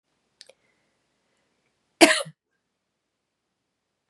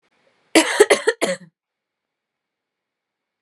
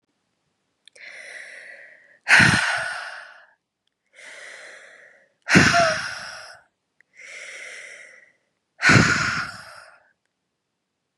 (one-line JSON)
{"cough_length": "4.1 s", "cough_amplitude": 31444, "cough_signal_mean_std_ratio": 0.15, "three_cough_length": "3.4 s", "three_cough_amplitude": 32767, "three_cough_signal_mean_std_ratio": 0.28, "exhalation_length": "11.2 s", "exhalation_amplitude": 30879, "exhalation_signal_mean_std_ratio": 0.35, "survey_phase": "beta (2021-08-13 to 2022-03-07)", "age": "18-44", "gender": "Female", "wearing_mask": "No", "symptom_cough_any": true, "symptom_runny_or_blocked_nose": true, "symptom_fatigue": true, "symptom_fever_high_temperature": true, "symptom_headache": true, "smoker_status": "Current smoker (e-cigarettes or vapes only)", "respiratory_condition_asthma": true, "respiratory_condition_other": false, "recruitment_source": "Test and Trace", "submission_delay": "2 days", "covid_test_result": "Positive", "covid_test_method": "LFT"}